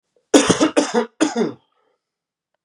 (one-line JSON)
{"cough_length": "2.6 s", "cough_amplitude": 32767, "cough_signal_mean_std_ratio": 0.42, "survey_phase": "beta (2021-08-13 to 2022-03-07)", "age": "18-44", "gender": "Male", "wearing_mask": "No", "symptom_new_continuous_cough": true, "symptom_runny_or_blocked_nose": true, "symptom_diarrhoea": true, "symptom_fatigue": true, "symptom_fever_high_temperature": true, "symptom_change_to_sense_of_smell_or_taste": true, "symptom_loss_of_taste": true, "symptom_onset": "4 days", "smoker_status": "Current smoker (e-cigarettes or vapes only)", "respiratory_condition_asthma": false, "respiratory_condition_other": false, "recruitment_source": "Test and Trace", "submission_delay": "1 day", "covid_test_result": "Positive", "covid_test_method": "RT-qPCR", "covid_ct_value": 19.7, "covid_ct_gene": "ORF1ab gene"}